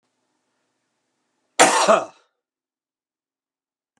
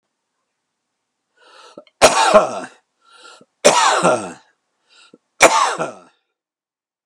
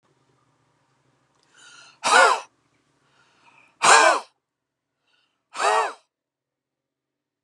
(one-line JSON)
{"cough_length": "4.0 s", "cough_amplitude": 32767, "cough_signal_mean_std_ratio": 0.25, "three_cough_length": "7.1 s", "three_cough_amplitude": 32768, "three_cough_signal_mean_std_ratio": 0.36, "exhalation_length": "7.4 s", "exhalation_amplitude": 29509, "exhalation_signal_mean_std_ratio": 0.29, "survey_phase": "beta (2021-08-13 to 2022-03-07)", "age": "65+", "gender": "Male", "wearing_mask": "No", "symptom_none": true, "smoker_status": "Ex-smoker", "respiratory_condition_asthma": false, "respiratory_condition_other": false, "recruitment_source": "REACT", "submission_delay": "1 day", "covid_test_result": "Negative", "covid_test_method": "RT-qPCR"}